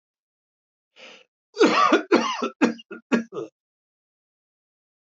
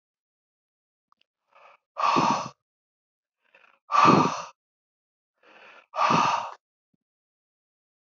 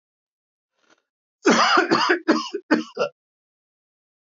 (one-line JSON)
{"three_cough_length": "5.0 s", "three_cough_amplitude": 21672, "three_cough_signal_mean_std_ratio": 0.36, "exhalation_length": "8.1 s", "exhalation_amplitude": 17603, "exhalation_signal_mean_std_ratio": 0.33, "cough_length": "4.3 s", "cough_amplitude": 22880, "cough_signal_mean_std_ratio": 0.41, "survey_phase": "beta (2021-08-13 to 2022-03-07)", "age": "65+", "gender": "Male", "wearing_mask": "No", "symptom_none": true, "smoker_status": "Never smoked", "respiratory_condition_asthma": false, "respiratory_condition_other": false, "recruitment_source": "REACT", "submission_delay": "2 days", "covid_test_result": "Negative", "covid_test_method": "RT-qPCR", "influenza_a_test_result": "Negative", "influenza_b_test_result": "Negative"}